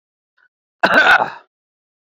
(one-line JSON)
{"cough_length": "2.1 s", "cough_amplitude": 27711, "cough_signal_mean_std_ratio": 0.37, "survey_phase": "beta (2021-08-13 to 2022-03-07)", "age": "45-64", "gender": "Male", "wearing_mask": "No", "symptom_none": true, "smoker_status": "Never smoked", "respiratory_condition_asthma": false, "respiratory_condition_other": false, "recruitment_source": "REACT", "submission_delay": "1 day", "covid_test_result": "Negative", "covid_test_method": "RT-qPCR"}